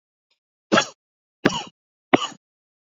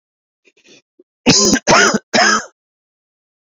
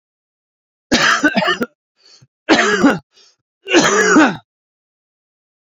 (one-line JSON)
{"exhalation_length": "3.0 s", "exhalation_amplitude": 27371, "exhalation_signal_mean_std_ratio": 0.24, "cough_length": "3.4 s", "cough_amplitude": 31376, "cough_signal_mean_std_ratio": 0.44, "three_cough_length": "5.7 s", "three_cough_amplitude": 29902, "three_cough_signal_mean_std_ratio": 0.46, "survey_phase": "alpha (2021-03-01 to 2021-08-12)", "age": "18-44", "gender": "Male", "wearing_mask": "No", "symptom_cough_any": true, "symptom_new_continuous_cough": true, "symptom_shortness_of_breath": true, "symptom_fatigue": true, "symptom_fever_high_temperature": true, "symptom_headache": true, "smoker_status": "Ex-smoker", "respiratory_condition_asthma": true, "respiratory_condition_other": false, "recruitment_source": "Test and Trace", "submission_delay": "2 days", "covid_test_result": "Positive", "covid_test_method": "RT-qPCR", "covid_ct_value": 13.8, "covid_ct_gene": "N gene", "covid_ct_mean": 15.1, "covid_viral_load": "11000000 copies/ml", "covid_viral_load_category": "High viral load (>1M copies/ml)"}